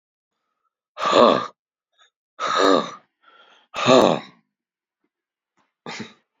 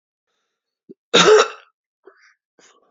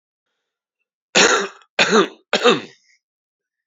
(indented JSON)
{
  "exhalation_length": "6.4 s",
  "exhalation_amplitude": 27664,
  "exhalation_signal_mean_std_ratio": 0.33,
  "cough_length": "2.9 s",
  "cough_amplitude": 30585,
  "cough_signal_mean_std_ratio": 0.28,
  "three_cough_length": "3.7 s",
  "three_cough_amplitude": 29065,
  "three_cough_signal_mean_std_ratio": 0.37,
  "survey_phase": "beta (2021-08-13 to 2022-03-07)",
  "age": "65+",
  "gender": "Male",
  "wearing_mask": "No",
  "symptom_new_continuous_cough": true,
  "symptom_runny_or_blocked_nose": true,
  "symptom_onset": "3 days",
  "smoker_status": "Prefer not to say",
  "respiratory_condition_asthma": false,
  "respiratory_condition_other": false,
  "recruitment_source": "Test and Trace",
  "submission_delay": "2 days",
  "covid_test_result": "Positive",
  "covid_test_method": "RT-qPCR",
  "covid_ct_value": 15.9,
  "covid_ct_gene": "ORF1ab gene",
  "covid_ct_mean": 17.1,
  "covid_viral_load": "2500000 copies/ml",
  "covid_viral_load_category": "High viral load (>1M copies/ml)"
}